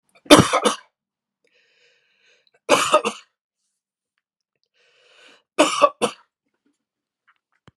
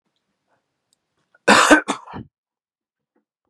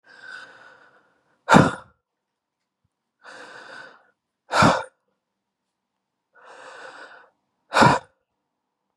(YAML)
three_cough_length: 7.8 s
three_cough_amplitude: 32768
three_cough_signal_mean_std_ratio: 0.25
cough_length: 3.5 s
cough_amplitude: 32768
cough_signal_mean_std_ratio: 0.26
exhalation_length: 9.0 s
exhalation_amplitude: 32713
exhalation_signal_mean_std_ratio: 0.24
survey_phase: beta (2021-08-13 to 2022-03-07)
age: 45-64
gender: Male
wearing_mask: 'No'
symptom_none: true
smoker_status: Never smoked
respiratory_condition_asthma: false
respiratory_condition_other: false
recruitment_source: REACT
submission_delay: 1 day
covid_test_result: Negative
covid_test_method: RT-qPCR
influenza_a_test_result: Negative
influenza_b_test_result: Negative